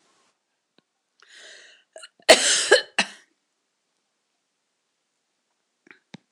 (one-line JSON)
{"cough_length": "6.3 s", "cough_amplitude": 26028, "cough_signal_mean_std_ratio": 0.21, "survey_phase": "beta (2021-08-13 to 2022-03-07)", "age": "65+", "gender": "Female", "wearing_mask": "No", "symptom_cough_any": true, "symptom_runny_or_blocked_nose": true, "symptom_shortness_of_breath": true, "smoker_status": "Never smoked", "respiratory_condition_asthma": true, "respiratory_condition_other": false, "recruitment_source": "REACT", "submission_delay": "3 days", "covid_test_result": "Negative", "covid_test_method": "RT-qPCR"}